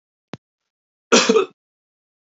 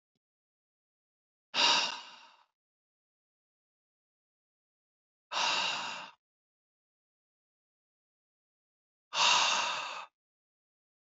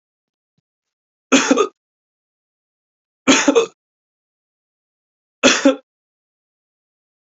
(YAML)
cough_length: 2.3 s
cough_amplitude: 30261
cough_signal_mean_std_ratio: 0.29
exhalation_length: 11.0 s
exhalation_amplitude: 7480
exhalation_signal_mean_std_ratio: 0.32
three_cough_length: 7.3 s
three_cough_amplitude: 28955
three_cough_signal_mean_std_ratio: 0.28
survey_phase: beta (2021-08-13 to 2022-03-07)
age: 18-44
gender: Male
wearing_mask: 'No'
symptom_none: true
smoker_status: Never smoked
respiratory_condition_asthma: false
respiratory_condition_other: false
recruitment_source: Test and Trace
submission_delay: 2 days
covid_test_result: Positive
covid_test_method: LFT